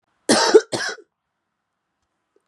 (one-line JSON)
{"cough_length": "2.5 s", "cough_amplitude": 32089, "cough_signal_mean_std_ratio": 0.3, "survey_phase": "beta (2021-08-13 to 2022-03-07)", "age": "18-44", "gender": "Female", "wearing_mask": "No", "symptom_cough_any": true, "symptom_shortness_of_breath": true, "symptom_fatigue": true, "symptom_change_to_sense_of_smell_or_taste": true, "symptom_onset": "5 days", "smoker_status": "Ex-smoker", "respiratory_condition_asthma": true, "respiratory_condition_other": false, "recruitment_source": "Test and Trace", "submission_delay": "2 days", "covid_test_result": "Positive", "covid_test_method": "RT-qPCR", "covid_ct_value": 18.2, "covid_ct_gene": "ORF1ab gene", "covid_ct_mean": 18.7, "covid_viral_load": "730000 copies/ml", "covid_viral_load_category": "Low viral load (10K-1M copies/ml)"}